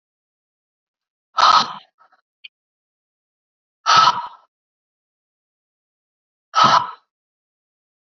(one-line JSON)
{"exhalation_length": "8.2 s", "exhalation_amplitude": 28612, "exhalation_signal_mean_std_ratio": 0.27, "survey_phase": "beta (2021-08-13 to 2022-03-07)", "age": "18-44", "gender": "Female", "wearing_mask": "No", "symptom_cough_any": true, "symptom_new_continuous_cough": true, "symptom_runny_or_blocked_nose": true, "symptom_shortness_of_breath": true, "symptom_sore_throat": true, "symptom_fatigue": true, "symptom_headache": true, "symptom_onset": "4 days", "smoker_status": "Never smoked", "respiratory_condition_asthma": true, "respiratory_condition_other": false, "recruitment_source": "Test and Trace", "submission_delay": "1 day", "covid_test_result": "Positive", "covid_test_method": "ePCR"}